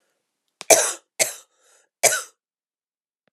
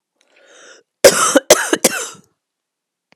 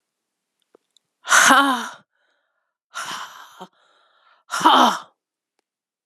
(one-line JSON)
{"three_cough_length": "3.3 s", "three_cough_amplitude": 32768, "three_cough_signal_mean_std_ratio": 0.26, "cough_length": "3.2 s", "cough_amplitude": 32768, "cough_signal_mean_std_ratio": 0.33, "exhalation_length": "6.1 s", "exhalation_amplitude": 32011, "exhalation_signal_mean_std_ratio": 0.33, "survey_phase": "beta (2021-08-13 to 2022-03-07)", "age": "45-64", "gender": "Female", "wearing_mask": "No", "symptom_cough_any": true, "symptom_runny_or_blocked_nose": true, "symptom_shortness_of_breath": true, "symptom_sore_throat": true, "symptom_fatigue": true, "symptom_fever_high_temperature": true, "symptom_headache": true, "symptom_onset": "2 days", "smoker_status": "Never smoked", "respiratory_condition_asthma": true, "respiratory_condition_other": false, "recruitment_source": "Test and Trace", "submission_delay": "1 day", "covid_test_result": "Positive", "covid_test_method": "RT-qPCR"}